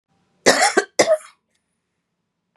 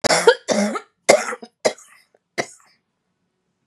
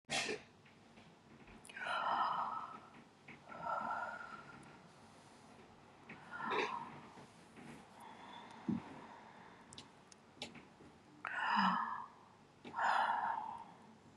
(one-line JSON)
{"cough_length": "2.6 s", "cough_amplitude": 32767, "cough_signal_mean_std_ratio": 0.34, "three_cough_length": "3.7 s", "three_cough_amplitude": 32768, "three_cough_signal_mean_std_ratio": 0.35, "exhalation_length": "14.2 s", "exhalation_amplitude": 2675, "exhalation_signal_mean_std_ratio": 0.55, "survey_phase": "beta (2021-08-13 to 2022-03-07)", "age": "65+", "gender": "Female", "wearing_mask": "No", "symptom_none": true, "smoker_status": "Never smoked", "respiratory_condition_asthma": false, "respiratory_condition_other": false, "recruitment_source": "REACT", "submission_delay": "2 days", "covid_test_result": "Negative", "covid_test_method": "RT-qPCR", "influenza_a_test_result": "Negative", "influenza_b_test_result": "Negative"}